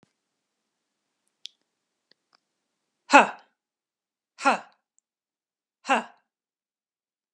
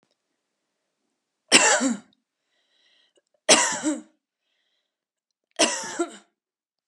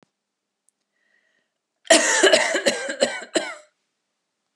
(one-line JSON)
{"exhalation_length": "7.3 s", "exhalation_amplitude": 32541, "exhalation_signal_mean_std_ratio": 0.16, "three_cough_length": "6.9 s", "three_cough_amplitude": 32690, "three_cough_signal_mean_std_ratio": 0.3, "cough_length": "4.6 s", "cough_amplitude": 30601, "cough_signal_mean_std_ratio": 0.38, "survey_phase": "beta (2021-08-13 to 2022-03-07)", "age": "18-44", "gender": "Female", "wearing_mask": "No", "symptom_none": true, "smoker_status": "Never smoked", "respiratory_condition_asthma": true, "respiratory_condition_other": false, "recruitment_source": "Test and Trace", "submission_delay": "2 days", "covid_test_result": "Negative", "covid_test_method": "ePCR"}